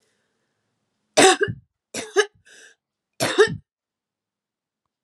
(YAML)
three_cough_length: 5.0 s
three_cough_amplitude: 31808
three_cough_signal_mean_std_ratio: 0.28
survey_phase: alpha (2021-03-01 to 2021-08-12)
age: 45-64
gender: Female
wearing_mask: 'No'
symptom_cough_any: true
symptom_fatigue: true
symptom_headache: true
symptom_onset: 3 days
smoker_status: Ex-smoker
respiratory_condition_asthma: false
respiratory_condition_other: false
recruitment_source: Test and Trace
submission_delay: 2 days
covid_test_result: Positive
covid_test_method: RT-qPCR
covid_ct_value: 21.8
covid_ct_gene: ORF1ab gene